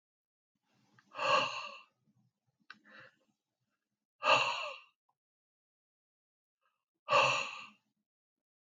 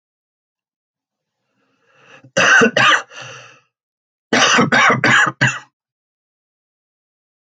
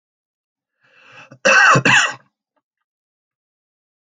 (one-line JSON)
{"exhalation_length": "8.8 s", "exhalation_amplitude": 6430, "exhalation_signal_mean_std_ratio": 0.3, "three_cough_length": "7.5 s", "three_cough_amplitude": 30489, "three_cough_signal_mean_std_ratio": 0.4, "cough_length": "4.1 s", "cough_amplitude": 28447, "cough_signal_mean_std_ratio": 0.33, "survey_phase": "alpha (2021-03-01 to 2021-08-12)", "age": "45-64", "gender": "Male", "wearing_mask": "No", "symptom_none": true, "smoker_status": "Ex-smoker", "respiratory_condition_asthma": false, "respiratory_condition_other": false, "recruitment_source": "REACT", "submission_delay": "4 days", "covid_test_result": "Negative", "covid_test_method": "RT-qPCR"}